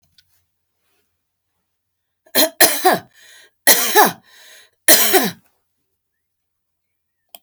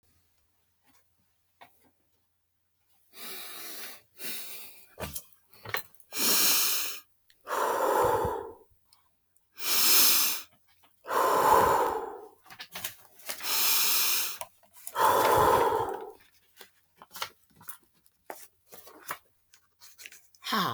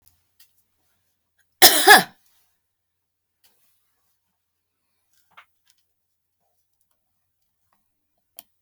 {"three_cough_length": "7.4 s", "three_cough_amplitude": 32768, "three_cough_signal_mean_std_ratio": 0.32, "exhalation_length": "20.7 s", "exhalation_amplitude": 14428, "exhalation_signal_mean_std_ratio": 0.49, "cough_length": "8.6 s", "cough_amplitude": 32768, "cough_signal_mean_std_ratio": 0.16, "survey_phase": "beta (2021-08-13 to 2022-03-07)", "age": "65+", "gender": "Female", "wearing_mask": "No", "symptom_none": true, "smoker_status": "Current smoker (1 to 10 cigarettes per day)", "respiratory_condition_asthma": false, "respiratory_condition_other": false, "recruitment_source": "REACT", "submission_delay": "3 days", "covid_test_result": "Negative", "covid_test_method": "RT-qPCR"}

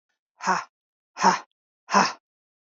{"exhalation_length": "2.6 s", "exhalation_amplitude": 17905, "exhalation_signal_mean_std_ratio": 0.34, "survey_phase": "beta (2021-08-13 to 2022-03-07)", "age": "45-64", "gender": "Female", "wearing_mask": "No", "symptom_none": true, "symptom_onset": "13 days", "smoker_status": "Never smoked", "respiratory_condition_asthma": false, "respiratory_condition_other": false, "recruitment_source": "REACT", "submission_delay": "1 day", "covid_test_result": "Negative", "covid_test_method": "RT-qPCR"}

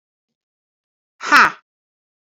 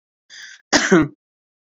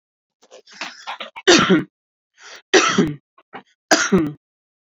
{"exhalation_length": "2.2 s", "exhalation_amplitude": 28601, "exhalation_signal_mean_std_ratio": 0.24, "cough_length": "1.6 s", "cough_amplitude": 29872, "cough_signal_mean_std_ratio": 0.37, "three_cough_length": "4.9 s", "three_cough_amplitude": 32767, "three_cough_signal_mean_std_ratio": 0.4, "survey_phase": "beta (2021-08-13 to 2022-03-07)", "age": "45-64", "gender": "Female", "wearing_mask": "No", "symptom_none": true, "smoker_status": "Never smoked", "respiratory_condition_asthma": false, "respiratory_condition_other": false, "recruitment_source": "REACT", "submission_delay": "1 day", "covid_test_result": "Negative", "covid_test_method": "RT-qPCR"}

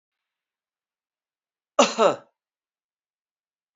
{"cough_length": "3.8 s", "cough_amplitude": 22801, "cough_signal_mean_std_ratio": 0.2, "survey_phase": "beta (2021-08-13 to 2022-03-07)", "age": "65+", "gender": "Male", "wearing_mask": "No", "symptom_cough_any": true, "symptom_runny_or_blocked_nose": true, "symptom_change_to_sense_of_smell_or_taste": true, "symptom_onset": "3 days", "smoker_status": "Ex-smoker", "respiratory_condition_asthma": false, "respiratory_condition_other": false, "recruitment_source": "Test and Trace", "submission_delay": "2 days", "covid_test_result": "Positive", "covid_test_method": "RT-qPCR"}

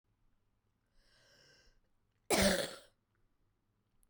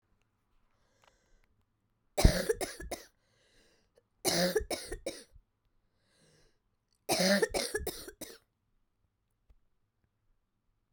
{"cough_length": "4.1 s", "cough_amplitude": 4990, "cough_signal_mean_std_ratio": 0.26, "three_cough_length": "10.9 s", "three_cough_amplitude": 12810, "three_cough_signal_mean_std_ratio": 0.3, "survey_phase": "beta (2021-08-13 to 2022-03-07)", "age": "18-44", "gender": "Female", "wearing_mask": "No", "symptom_cough_any": true, "symptom_runny_or_blocked_nose": true, "symptom_shortness_of_breath": true, "symptom_sore_throat": true, "symptom_fatigue": true, "symptom_headache": true, "symptom_change_to_sense_of_smell_or_taste": true, "symptom_loss_of_taste": true, "symptom_onset": "7 days", "smoker_status": "Prefer not to say", "respiratory_condition_asthma": true, "respiratory_condition_other": false, "recruitment_source": "Test and Trace", "submission_delay": "1 day", "covid_test_result": "Positive", "covid_test_method": "RT-qPCR"}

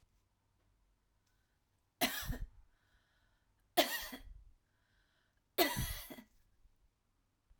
{"three_cough_length": "7.6 s", "three_cough_amplitude": 5641, "three_cough_signal_mean_std_ratio": 0.29, "survey_phase": "alpha (2021-03-01 to 2021-08-12)", "age": "45-64", "gender": "Female", "wearing_mask": "No", "symptom_cough_any": true, "symptom_fatigue": true, "symptom_headache": true, "symptom_onset": "6 days", "smoker_status": "Ex-smoker", "respiratory_condition_asthma": true, "respiratory_condition_other": false, "recruitment_source": "REACT", "submission_delay": "1 day", "covid_test_result": "Negative", "covid_test_method": "RT-qPCR"}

